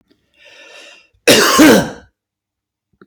{
  "cough_length": "3.1 s",
  "cough_amplitude": 32768,
  "cough_signal_mean_std_ratio": 0.39,
  "survey_phase": "beta (2021-08-13 to 2022-03-07)",
  "age": "45-64",
  "gender": "Male",
  "wearing_mask": "No",
  "symptom_cough_any": true,
  "symptom_sore_throat": true,
  "smoker_status": "Never smoked",
  "respiratory_condition_asthma": true,
  "respiratory_condition_other": false,
  "recruitment_source": "REACT",
  "submission_delay": "1 day",
  "covid_test_result": "Negative",
  "covid_test_method": "RT-qPCR",
  "influenza_a_test_result": "Negative",
  "influenza_b_test_result": "Negative"
}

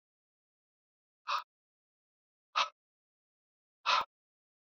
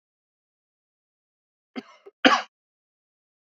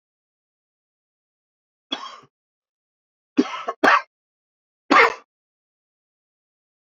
{
  "exhalation_length": "4.8 s",
  "exhalation_amplitude": 4849,
  "exhalation_signal_mean_std_ratio": 0.22,
  "cough_length": "3.5 s",
  "cough_amplitude": 26321,
  "cough_signal_mean_std_ratio": 0.16,
  "three_cough_length": "6.9 s",
  "three_cough_amplitude": 26835,
  "three_cough_signal_mean_std_ratio": 0.22,
  "survey_phase": "beta (2021-08-13 to 2022-03-07)",
  "age": "45-64",
  "gender": "Male",
  "wearing_mask": "No",
  "symptom_cough_any": true,
  "symptom_runny_or_blocked_nose": true,
  "symptom_fatigue": true,
  "symptom_headache": true,
  "symptom_change_to_sense_of_smell_or_taste": true,
  "symptom_loss_of_taste": true,
  "smoker_status": "Never smoked",
  "respiratory_condition_asthma": false,
  "respiratory_condition_other": false,
  "recruitment_source": "Test and Trace",
  "submission_delay": "2 days",
  "covid_test_result": "Positive",
  "covid_test_method": "LFT"
}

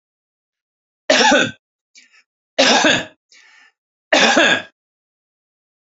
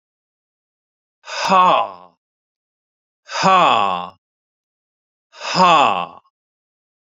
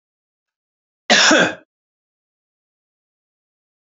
{
  "three_cough_length": "5.9 s",
  "three_cough_amplitude": 32767,
  "three_cough_signal_mean_std_ratio": 0.39,
  "exhalation_length": "7.2 s",
  "exhalation_amplitude": 29367,
  "exhalation_signal_mean_std_ratio": 0.39,
  "cough_length": "3.8 s",
  "cough_amplitude": 32143,
  "cough_signal_mean_std_ratio": 0.26,
  "survey_phase": "beta (2021-08-13 to 2022-03-07)",
  "age": "45-64",
  "gender": "Male",
  "wearing_mask": "No",
  "symptom_none": true,
  "smoker_status": "Never smoked",
  "respiratory_condition_asthma": false,
  "respiratory_condition_other": false,
  "recruitment_source": "REACT",
  "submission_delay": "1 day",
  "covid_test_result": "Negative",
  "covid_test_method": "RT-qPCR",
  "influenza_a_test_result": "Negative",
  "influenza_b_test_result": "Negative"
}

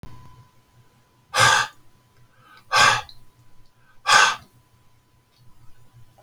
{
  "exhalation_length": "6.2 s",
  "exhalation_amplitude": 28200,
  "exhalation_signal_mean_std_ratio": 0.33,
  "survey_phase": "beta (2021-08-13 to 2022-03-07)",
  "age": "65+",
  "gender": "Male",
  "wearing_mask": "No",
  "symptom_cough_any": true,
  "symptom_fatigue": true,
  "smoker_status": "Never smoked",
  "respiratory_condition_asthma": false,
  "respiratory_condition_other": false,
  "recruitment_source": "REACT",
  "submission_delay": "3 days",
  "covid_test_result": "Negative",
  "covid_test_method": "RT-qPCR"
}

